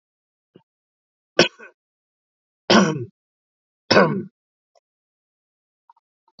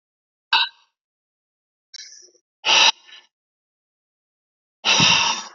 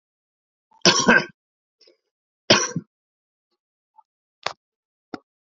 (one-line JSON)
{"three_cough_length": "6.4 s", "three_cough_amplitude": 32767, "three_cough_signal_mean_std_ratio": 0.24, "exhalation_length": "5.5 s", "exhalation_amplitude": 27717, "exhalation_signal_mean_std_ratio": 0.34, "cough_length": "5.5 s", "cough_amplitude": 29321, "cough_signal_mean_std_ratio": 0.24, "survey_phase": "alpha (2021-03-01 to 2021-08-12)", "age": "45-64", "gender": "Male", "wearing_mask": "No", "symptom_none": true, "smoker_status": "Ex-smoker", "respiratory_condition_asthma": false, "respiratory_condition_other": true, "recruitment_source": "REACT", "submission_delay": "4 days", "covid_test_result": "Negative", "covid_test_method": "RT-qPCR"}